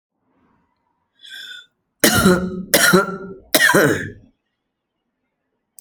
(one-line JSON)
{"three_cough_length": "5.8 s", "three_cough_amplitude": 32768, "three_cough_signal_mean_std_ratio": 0.4, "survey_phase": "alpha (2021-03-01 to 2021-08-12)", "age": "45-64", "gender": "Female", "wearing_mask": "No", "symptom_cough_any": true, "symptom_change_to_sense_of_smell_or_taste": true, "symptom_loss_of_taste": true, "symptom_onset": "5 days", "smoker_status": "Never smoked", "respiratory_condition_asthma": false, "respiratory_condition_other": false, "recruitment_source": "Test and Trace", "submission_delay": "1 day", "covid_test_result": "Positive", "covid_test_method": "RT-qPCR"}